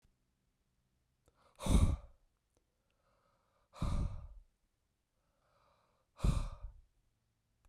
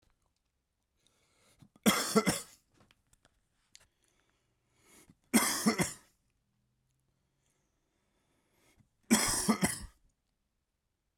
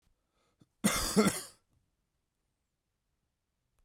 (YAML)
exhalation_length: 7.7 s
exhalation_amplitude: 4560
exhalation_signal_mean_std_ratio: 0.29
three_cough_length: 11.2 s
three_cough_amplitude: 9208
three_cough_signal_mean_std_ratio: 0.28
cough_length: 3.8 s
cough_amplitude: 8295
cough_signal_mean_std_ratio: 0.27
survey_phase: beta (2021-08-13 to 2022-03-07)
age: 18-44
gender: Male
wearing_mask: 'No'
symptom_cough_any: true
symptom_runny_or_blocked_nose: true
symptom_fatigue: true
symptom_headache: true
smoker_status: Never smoked
respiratory_condition_asthma: false
respiratory_condition_other: false
recruitment_source: Test and Trace
submission_delay: 2 days
covid_test_result: Positive
covid_test_method: LFT